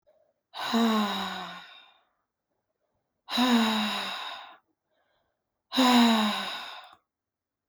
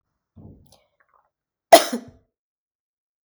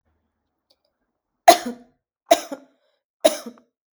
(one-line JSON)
{"exhalation_length": "7.7 s", "exhalation_amplitude": 11778, "exhalation_signal_mean_std_ratio": 0.48, "cough_length": "3.2 s", "cough_amplitude": 32768, "cough_signal_mean_std_ratio": 0.15, "three_cough_length": "3.9 s", "three_cough_amplitude": 32768, "three_cough_signal_mean_std_ratio": 0.2, "survey_phase": "beta (2021-08-13 to 2022-03-07)", "age": "18-44", "gender": "Female", "wearing_mask": "No", "symptom_none": true, "smoker_status": "Current smoker (e-cigarettes or vapes only)", "respiratory_condition_asthma": false, "respiratory_condition_other": false, "recruitment_source": "REACT", "submission_delay": "2 days", "covid_test_result": "Negative", "covid_test_method": "RT-qPCR"}